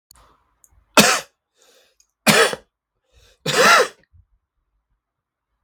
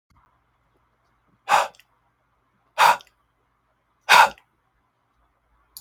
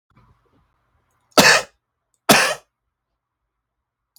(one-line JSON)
{"three_cough_length": "5.6 s", "three_cough_amplitude": 32768, "three_cough_signal_mean_std_ratio": 0.31, "exhalation_length": "5.8 s", "exhalation_amplitude": 30629, "exhalation_signal_mean_std_ratio": 0.23, "cough_length": "4.2 s", "cough_amplitude": 32768, "cough_signal_mean_std_ratio": 0.26, "survey_phase": "beta (2021-08-13 to 2022-03-07)", "age": "18-44", "gender": "Male", "wearing_mask": "No", "symptom_none": true, "smoker_status": "Ex-smoker", "respiratory_condition_asthma": true, "respiratory_condition_other": false, "recruitment_source": "REACT", "submission_delay": "1 day", "covid_test_result": "Negative", "covid_test_method": "RT-qPCR", "influenza_a_test_result": "Unknown/Void", "influenza_b_test_result": "Unknown/Void"}